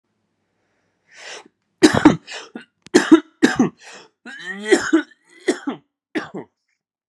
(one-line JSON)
{"three_cough_length": "7.1 s", "three_cough_amplitude": 32768, "three_cough_signal_mean_std_ratio": 0.32, "survey_phase": "alpha (2021-03-01 to 2021-08-12)", "age": "18-44", "gender": "Male", "wearing_mask": "No", "symptom_cough_any": true, "symptom_new_continuous_cough": true, "symptom_fever_high_temperature": true, "symptom_onset": "2 days", "smoker_status": "Never smoked", "respiratory_condition_asthma": false, "respiratory_condition_other": false, "recruitment_source": "Test and Trace", "submission_delay": "2 days", "covid_test_result": "Positive", "covid_test_method": "RT-qPCR"}